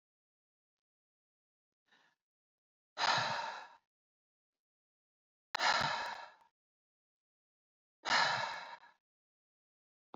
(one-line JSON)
{"exhalation_length": "10.2 s", "exhalation_amplitude": 4307, "exhalation_signal_mean_std_ratio": 0.32, "survey_phase": "beta (2021-08-13 to 2022-03-07)", "age": "18-44", "gender": "Female", "wearing_mask": "No", "symptom_cough_any": true, "symptom_sore_throat": true, "symptom_fatigue": true, "symptom_fever_high_temperature": true, "symptom_headache": true, "symptom_onset": "3 days", "smoker_status": "Never smoked", "respiratory_condition_asthma": false, "respiratory_condition_other": false, "recruitment_source": "Test and Trace", "submission_delay": "2 days", "covid_test_result": "Positive", "covid_test_method": "RT-qPCR", "covid_ct_value": 16.3, "covid_ct_gene": "ORF1ab gene", "covid_ct_mean": 16.4, "covid_viral_load": "4300000 copies/ml", "covid_viral_load_category": "High viral load (>1M copies/ml)"}